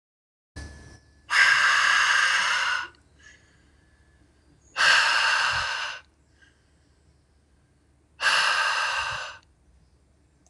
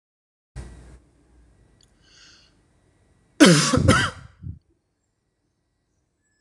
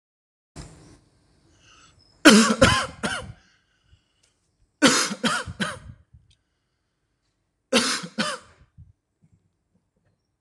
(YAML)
exhalation_length: 10.5 s
exhalation_amplitude: 16493
exhalation_signal_mean_std_ratio: 0.52
cough_length: 6.4 s
cough_amplitude: 26027
cough_signal_mean_std_ratio: 0.26
three_cough_length: 10.4 s
three_cough_amplitude: 26028
three_cough_signal_mean_std_ratio: 0.3
survey_phase: alpha (2021-03-01 to 2021-08-12)
age: 18-44
gender: Male
wearing_mask: 'No'
symptom_none: true
smoker_status: Never smoked
respiratory_condition_asthma: false
respiratory_condition_other: false
recruitment_source: REACT
submission_delay: 2 days
covid_test_result: Negative
covid_test_method: RT-qPCR